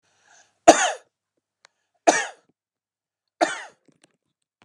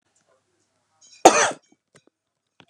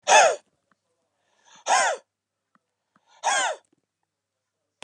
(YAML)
three_cough_length: 4.6 s
three_cough_amplitude: 32768
three_cough_signal_mean_std_ratio: 0.22
cough_length: 2.7 s
cough_amplitude: 32768
cough_signal_mean_std_ratio: 0.21
exhalation_length: 4.8 s
exhalation_amplitude: 24086
exhalation_signal_mean_std_ratio: 0.32
survey_phase: beta (2021-08-13 to 2022-03-07)
age: 45-64
gender: Male
wearing_mask: 'No'
symptom_cough_any: true
symptom_other: true
symptom_onset: 13 days
smoker_status: Ex-smoker
respiratory_condition_asthma: false
respiratory_condition_other: false
recruitment_source: REACT
submission_delay: 2 days
covid_test_result: Negative
covid_test_method: RT-qPCR
influenza_a_test_result: Negative
influenza_b_test_result: Negative